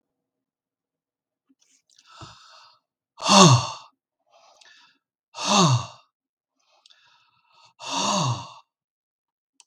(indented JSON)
{
  "exhalation_length": "9.7 s",
  "exhalation_amplitude": 32767,
  "exhalation_signal_mean_std_ratio": 0.28,
  "survey_phase": "beta (2021-08-13 to 2022-03-07)",
  "age": "65+",
  "gender": "Male",
  "wearing_mask": "No",
  "symptom_none": true,
  "smoker_status": "Never smoked",
  "respiratory_condition_asthma": false,
  "respiratory_condition_other": false,
  "recruitment_source": "REACT",
  "submission_delay": "7 days",
  "covid_test_result": "Negative",
  "covid_test_method": "RT-qPCR"
}